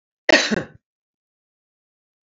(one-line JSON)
{"cough_length": "2.4 s", "cough_amplitude": 28950, "cough_signal_mean_std_ratio": 0.24, "survey_phase": "alpha (2021-03-01 to 2021-08-12)", "age": "65+", "gender": "Female", "wearing_mask": "No", "symptom_none": true, "smoker_status": "Ex-smoker", "respiratory_condition_asthma": false, "respiratory_condition_other": false, "recruitment_source": "REACT", "submission_delay": "1 day", "covid_test_result": "Negative", "covid_test_method": "RT-qPCR"}